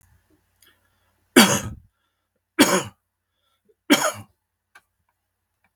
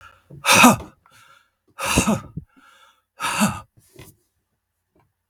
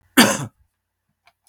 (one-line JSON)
{"three_cough_length": "5.8 s", "three_cough_amplitude": 32768, "three_cough_signal_mean_std_ratio": 0.25, "exhalation_length": "5.3 s", "exhalation_amplitude": 32767, "exhalation_signal_mean_std_ratio": 0.33, "cough_length": "1.5 s", "cough_amplitude": 32768, "cough_signal_mean_std_ratio": 0.29, "survey_phase": "beta (2021-08-13 to 2022-03-07)", "age": "65+", "gender": "Male", "wearing_mask": "No", "symptom_none": true, "symptom_onset": "8 days", "smoker_status": "Never smoked", "respiratory_condition_asthma": false, "respiratory_condition_other": false, "recruitment_source": "REACT", "submission_delay": "3 days", "covid_test_result": "Negative", "covid_test_method": "RT-qPCR", "influenza_a_test_result": "Negative", "influenza_b_test_result": "Negative"}